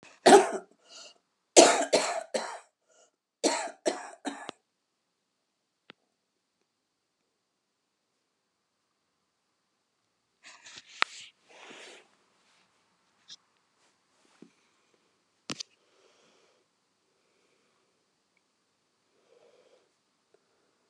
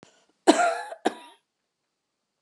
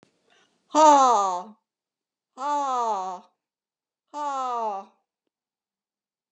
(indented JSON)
{
  "three_cough_length": "20.9 s",
  "three_cough_amplitude": 26284,
  "three_cough_signal_mean_std_ratio": 0.17,
  "cough_length": "2.4 s",
  "cough_amplitude": 25858,
  "cough_signal_mean_std_ratio": 0.29,
  "exhalation_length": "6.3 s",
  "exhalation_amplitude": 22358,
  "exhalation_signal_mean_std_ratio": 0.4,
  "survey_phase": "beta (2021-08-13 to 2022-03-07)",
  "age": "65+",
  "gender": "Female",
  "wearing_mask": "No",
  "symptom_cough_any": true,
  "symptom_shortness_of_breath": true,
  "symptom_fatigue": true,
  "symptom_fever_high_temperature": true,
  "symptom_headache": true,
  "symptom_change_to_sense_of_smell_or_taste": true,
  "symptom_loss_of_taste": true,
  "symptom_onset": "5 days",
  "smoker_status": "Never smoked",
  "respiratory_condition_asthma": true,
  "respiratory_condition_other": false,
  "recruitment_source": "Test and Trace",
  "submission_delay": "2 days",
  "covid_test_result": "Positive",
  "covid_test_method": "RT-qPCR",
  "covid_ct_value": 19.0,
  "covid_ct_gene": "ORF1ab gene"
}